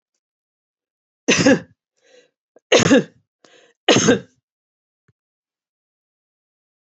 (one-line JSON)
{"three_cough_length": "6.8 s", "three_cough_amplitude": 27728, "three_cough_signal_mean_std_ratio": 0.28, "survey_phase": "beta (2021-08-13 to 2022-03-07)", "age": "65+", "gender": "Female", "wearing_mask": "No", "symptom_none": true, "smoker_status": "Never smoked", "respiratory_condition_asthma": false, "respiratory_condition_other": false, "recruitment_source": "REACT", "submission_delay": "2 days", "covid_test_result": "Negative", "covid_test_method": "RT-qPCR"}